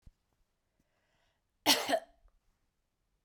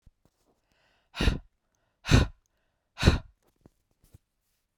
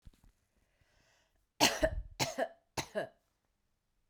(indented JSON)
{
  "cough_length": "3.2 s",
  "cough_amplitude": 9140,
  "cough_signal_mean_std_ratio": 0.23,
  "exhalation_length": "4.8 s",
  "exhalation_amplitude": 21155,
  "exhalation_signal_mean_std_ratio": 0.24,
  "three_cough_length": "4.1 s",
  "three_cough_amplitude": 8154,
  "three_cough_signal_mean_std_ratio": 0.32,
  "survey_phase": "beta (2021-08-13 to 2022-03-07)",
  "age": "45-64",
  "gender": "Female",
  "wearing_mask": "No",
  "symptom_runny_or_blocked_nose": true,
  "symptom_fatigue": true,
  "smoker_status": "Ex-smoker",
  "respiratory_condition_asthma": true,
  "respiratory_condition_other": false,
  "recruitment_source": "REACT",
  "submission_delay": "2 days",
  "covid_test_result": "Negative",
  "covid_test_method": "RT-qPCR"
}